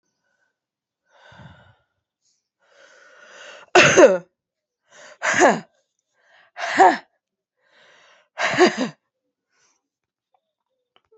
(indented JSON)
{
  "exhalation_length": "11.2 s",
  "exhalation_amplitude": 32767,
  "exhalation_signal_mean_std_ratio": 0.27,
  "survey_phase": "alpha (2021-03-01 to 2021-08-12)",
  "age": "18-44",
  "gender": "Female",
  "wearing_mask": "No",
  "symptom_cough_any": true,
  "symptom_new_continuous_cough": true,
  "symptom_shortness_of_breath": true,
  "symptom_abdominal_pain": true,
  "symptom_fatigue": true,
  "symptom_fever_high_temperature": true,
  "symptom_headache": true,
  "symptom_change_to_sense_of_smell_or_taste": true,
  "symptom_loss_of_taste": true,
  "symptom_onset": "3 days",
  "smoker_status": "Never smoked",
  "respiratory_condition_asthma": false,
  "respiratory_condition_other": false,
  "recruitment_source": "Test and Trace",
  "submission_delay": "1 day",
  "covid_test_result": "Positive",
  "covid_test_method": "RT-qPCR",
  "covid_ct_value": 17.9,
  "covid_ct_gene": "N gene",
  "covid_ct_mean": 18.6,
  "covid_viral_load": "790000 copies/ml",
  "covid_viral_load_category": "Low viral load (10K-1M copies/ml)"
}